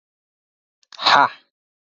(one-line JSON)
{"exhalation_length": "1.9 s", "exhalation_amplitude": 28074, "exhalation_signal_mean_std_ratio": 0.28, "survey_phase": "alpha (2021-03-01 to 2021-08-12)", "age": "18-44", "gender": "Male", "wearing_mask": "No", "symptom_cough_any": true, "symptom_change_to_sense_of_smell_or_taste": true, "smoker_status": "Prefer not to say", "respiratory_condition_asthma": false, "respiratory_condition_other": false, "recruitment_source": "Test and Trace", "submission_delay": "2 days", "covid_test_result": "Positive", "covid_test_method": "LFT"}